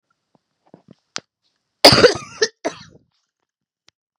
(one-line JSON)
{"cough_length": "4.2 s", "cough_amplitude": 32768, "cough_signal_mean_std_ratio": 0.23, "survey_phase": "beta (2021-08-13 to 2022-03-07)", "age": "45-64", "gender": "Female", "wearing_mask": "No", "symptom_cough_any": true, "symptom_runny_or_blocked_nose": true, "symptom_fatigue": true, "symptom_headache": true, "symptom_change_to_sense_of_smell_or_taste": true, "symptom_loss_of_taste": true, "symptom_onset": "13 days", "smoker_status": "Never smoked", "respiratory_condition_asthma": false, "respiratory_condition_other": false, "recruitment_source": "Test and Trace", "submission_delay": "2 days", "covid_test_result": "Positive", "covid_test_method": "RT-qPCR", "covid_ct_value": 29.0, "covid_ct_gene": "N gene"}